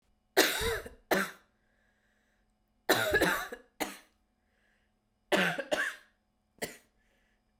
{"three_cough_length": "7.6 s", "three_cough_amplitude": 14116, "three_cough_signal_mean_std_ratio": 0.38, "survey_phase": "beta (2021-08-13 to 2022-03-07)", "age": "18-44", "gender": "Female", "wearing_mask": "No", "symptom_cough_any": true, "symptom_fatigue": true, "symptom_fever_high_temperature": true, "symptom_headache": true, "smoker_status": "Never smoked", "respiratory_condition_asthma": false, "respiratory_condition_other": false, "recruitment_source": "Test and Trace", "submission_delay": "1 day", "covid_test_result": "Positive", "covid_test_method": "RT-qPCR", "covid_ct_value": 16.4, "covid_ct_gene": "ORF1ab gene", "covid_ct_mean": 16.9, "covid_viral_load": "2900000 copies/ml", "covid_viral_load_category": "High viral load (>1M copies/ml)"}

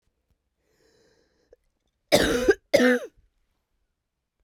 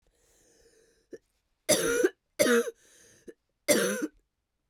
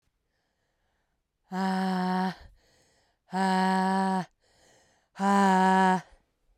{"cough_length": "4.4 s", "cough_amplitude": 21473, "cough_signal_mean_std_ratio": 0.3, "three_cough_length": "4.7 s", "three_cough_amplitude": 13292, "three_cough_signal_mean_std_ratio": 0.39, "exhalation_length": "6.6 s", "exhalation_amplitude": 8254, "exhalation_signal_mean_std_ratio": 0.54, "survey_phase": "beta (2021-08-13 to 2022-03-07)", "age": "45-64", "gender": "Female", "wearing_mask": "No", "symptom_cough_any": true, "symptom_runny_or_blocked_nose": true, "symptom_sore_throat": true, "symptom_other": true, "symptom_onset": "2 days", "smoker_status": "Never smoked", "respiratory_condition_asthma": false, "respiratory_condition_other": false, "recruitment_source": "Test and Trace", "submission_delay": "2 days", "covid_test_result": "Positive", "covid_test_method": "RT-qPCR", "covid_ct_value": 23.2, "covid_ct_gene": "ORF1ab gene"}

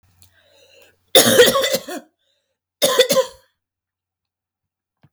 {"cough_length": "5.1 s", "cough_amplitude": 32768, "cough_signal_mean_std_ratio": 0.35, "survey_phase": "beta (2021-08-13 to 2022-03-07)", "age": "45-64", "gender": "Female", "wearing_mask": "No", "symptom_none": true, "smoker_status": "Never smoked", "respiratory_condition_asthma": true, "respiratory_condition_other": false, "recruitment_source": "REACT", "submission_delay": "1 day", "covid_test_result": "Negative", "covid_test_method": "RT-qPCR"}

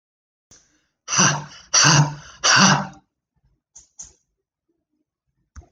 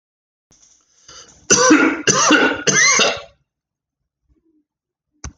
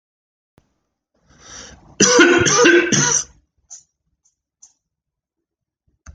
{"exhalation_length": "5.7 s", "exhalation_amplitude": 32767, "exhalation_signal_mean_std_ratio": 0.36, "three_cough_length": "5.4 s", "three_cough_amplitude": 32767, "three_cough_signal_mean_std_ratio": 0.45, "cough_length": "6.1 s", "cough_amplitude": 30922, "cough_signal_mean_std_ratio": 0.37, "survey_phase": "alpha (2021-03-01 to 2021-08-12)", "age": "45-64", "gender": "Male", "wearing_mask": "No", "symptom_fatigue": true, "symptom_onset": "8 days", "smoker_status": "Ex-smoker", "respiratory_condition_asthma": false, "respiratory_condition_other": false, "recruitment_source": "REACT", "submission_delay": "1 day", "covid_test_result": "Negative", "covid_test_method": "RT-qPCR"}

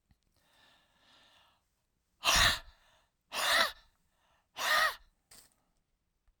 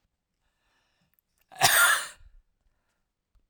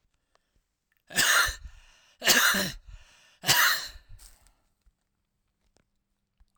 {"exhalation_length": "6.4 s", "exhalation_amplitude": 7851, "exhalation_signal_mean_std_ratio": 0.33, "cough_length": "3.5 s", "cough_amplitude": 18964, "cough_signal_mean_std_ratio": 0.28, "three_cough_length": "6.6 s", "three_cough_amplitude": 15339, "three_cough_signal_mean_std_ratio": 0.36, "survey_phase": "beta (2021-08-13 to 2022-03-07)", "age": "65+", "gender": "Male", "wearing_mask": "No", "symptom_cough_any": true, "symptom_runny_or_blocked_nose": true, "symptom_fatigue": true, "symptom_headache": true, "symptom_change_to_sense_of_smell_or_taste": true, "smoker_status": "Never smoked", "respiratory_condition_asthma": true, "respiratory_condition_other": false, "recruitment_source": "Test and Trace", "submission_delay": "1 day", "covid_test_result": "Positive", "covid_test_method": "RT-qPCR", "covid_ct_value": 13.3, "covid_ct_gene": "ORF1ab gene", "covid_ct_mean": 13.8, "covid_viral_load": "29000000 copies/ml", "covid_viral_load_category": "High viral load (>1M copies/ml)"}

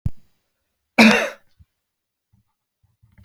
{"cough_length": "3.2 s", "cough_amplitude": 29014, "cough_signal_mean_std_ratio": 0.26, "survey_phase": "alpha (2021-03-01 to 2021-08-12)", "age": "45-64", "gender": "Male", "wearing_mask": "No", "symptom_none": true, "symptom_onset": "7 days", "smoker_status": "Never smoked", "respiratory_condition_asthma": false, "respiratory_condition_other": false, "recruitment_source": "REACT", "submission_delay": "2 days", "covid_test_result": "Negative", "covid_test_method": "RT-qPCR"}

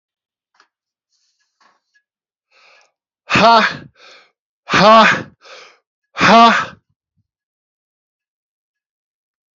{"exhalation_length": "9.6 s", "exhalation_amplitude": 30876, "exhalation_signal_mean_std_ratio": 0.31, "survey_phase": "alpha (2021-03-01 to 2021-08-12)", "age": "45-64", "gender": "Male", "wearing_mask": "No", "symptom_cough_any": true, "symptom_new_continuous_cough": true, "symptom_fatigue": true, "symptom_fever_high_temperature": true, "symptom_headache": true, "symptom_change_to_sense_of_smell_or_taste": true, "symptom_onset": "4 days", "smoker_status": "Ex-smoker", "respiratory_condition_asthma": false, "respiratory_condition_other": false, "recruitment_source": "Test and Trace", "submission_delay": "1 day", "covid_test_result": "Positive", "covid_test_method": "RT-qPCR", "covid_ct_value": 14.9, "covid_ct_gene": "ORF1ab gene", "covid_ct_mean": 15.2, "covid_viral_load": "10000000 copies/ml", "covid_viral_load_category": "High viral load (>1M copies/ml)"}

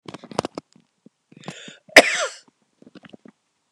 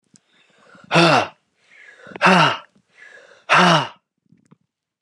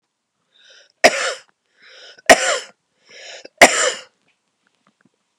{"cough_length": "3.7 s", "cough_amplitude": 32768, "cough_signal_mean_std_ratio": 0.19, "exhalation_length": "5.0 s", "exhalation_amplitude": 30608, "exhalation_signal_mean_std_ratio": 0.38, "three_cough_length": "5.4 s", "three_cough_amplitude": 32768, "three_cough_signal_mean_std_ratio": 0.26, "survey_phase": "beta (2021-08-13 to 2022-03-07)", "age": "45-64", "gender": "Male", "wearing_mask": "No", "symptom_cough_any": true, "symptom_runny_or_blocked_nose": true, "symptom_sore_throat": true, "symptom_fever_high_temperature": true, "symptom_headache": true, "symptom_onset": "2 days", "smoker_status": "Never smoked", "respiratory_condition_asthma": true, "respiratory_condition_other": false, "recruitment_source": "REACT", "submission_delay": "1 day", "covid_test_result": "Positive", "covid_test_method": "RT-qPCR", "covid_ct_value": 19.3, "covid_ct_gene": "E gene", "influenza_a_test_result": "Negative", "influenza_b_test_result": "Negative"}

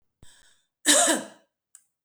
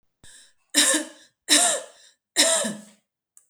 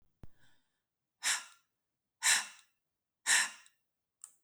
{"cough_length": "2.0 s", "cough_amplitude": 18198, "cough_signal_mean_std_ratio": 0.34, "three_cough_length": "3.5 s", "three_cough_amplitude": 27017, "three_cough_signal_mean_std_ratio": 0.43, "exhalation_length": "4.4 s", "exhalation_amplitude": 7478, "exhalation_signal_mean_std_ratio": 0.3, "survey_phase": "beta (2021-08-13 to 2022-03-07)", "age": "45-64", "gender": "Female", "wearing_mask": "No", "symptom_none": true, "smoker_status": "Never smoked", "respiratory_condition_asthma": false, "respiratory_condition_other": false, "recruitment_source": "REACT", "submission_delay": "1 day", "covid_test_result": "Negative", "covid_test_method": "RT-qPCR"}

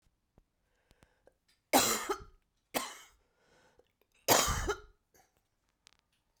{"three_cough_length": "6.4 s", "three_cough_amplitude": 10033, "three_cough_signal_mean_std_ratio": 0.29, "survey_phase": "beta (2021-08-13 to 2022-03-07)", "age": "65+", "gender": "Female", "wearing_mask": "No", "symptom_cough_any": true, "symptom_sore_throat": true, "symptom_fatigue": true, "symptom_headache": true, "symptom_change_to_sense_of_smell_or_taste": true, "symptom_loss_of_taste": true, "symptom_onset": "4 days", "smoker_status": "Ex-smoker", "respiratory_condition_asthma": false, "respiratory_condition_other": true, "recruitment_source": "Test and Trace", "submission_delay": "2 days", "covid_test_result": "Positive", "covid_test_method": "RT-qPCR", "covid_ct_value": 35.7, "covid_ct_gene": "ORF1ab gene"}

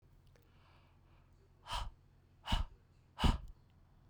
{"exhalation_length": "4.1 s", "exhalation_amplitude": 4324, "exhalation_signal_mean_std_ratio": 0.31, "survey_phase": "beta (2021-08-13 to 2022-03-07)", "age": "18-44", "gender": "Female", "wearing_mask": "No", "symptom_cough_any": true, "symptom_new_continuous_cough": true, "symptom_runny_or_blocked_nose": true, "symptom_fatigue": true, "symptom_fever_high_temperature": true, "symptom_headache": true, "symptom_change_to_sense_of_smell_or_taste": true, "symptom_loss_of_taste": true, "symptom_onset": "3 days", "smoker_status": "Never smoked", "respiratory_condition_asthma": false, "respiratory_condition_other": false, "recruitment_source": "Test and Trace", "submission_delay": "2 days", "covid_test_result": "Positive", "covid_test_method": "RT-qPCR", "covid_ct_value": 27.5, "covid_ct_gene": "N gene"}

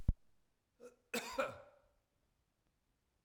{"cough_length": "3.2 s", "cough_amplitude": 4089, "cough_signal_mean_std_ratio": 0.26, "survey_phase": "beta (2021-08-13 to 2022-03-07)", "age": "65+", "gender": "Male", "wearing_mask": "No", "symptom_abdominal_pain": true, "symptom_onset": "12 days", "smoker_status": "Never smoked", "respiratory_condition_asthma": false, "respiratory_condition_other": false, "recruitment_source": "REACT", "submission_delay": "6 days", "covid_test_result": "Negative", "covid_test_method": "RT-qPCR", "influenza_a_test_result": "Negative", "influenza_b_test_result": "Negative"}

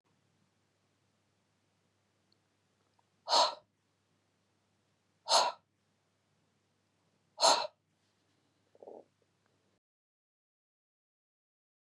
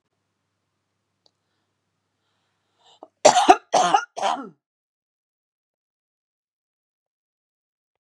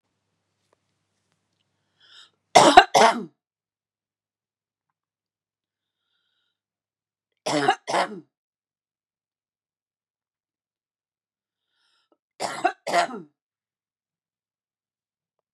{"exhalation_length": "11.9 s", "exhalation_amplitude": 8124, "exhalation_signal_mean_std_ratio": 0.19, "cough_length": "8.0 s", "cough_amplitude": 32767, "cough_signal_mean_std_ratio": 0.21, "three_cough_length": "15.5 s", "three_cough_amplitude": 32768, "three_cough_signal_mean_std_ratio": 0.19, "survey_phase": "beta (2021-08-13 to 2022-03-07)", "age": "45-64", "gender": "Female", "wearing_mask": "No", "symptom_none": true, "symptom_onset": "2 days", "smoker_status": "Never smoked", "respiratory_condition_asthma": false, "respiratory_condition_other": false, "recruitment_source": "Test and Trace", "submission_delay": "1 day", "covid_test_result": "Negative", "covid_test_method": "RT-qPCR"}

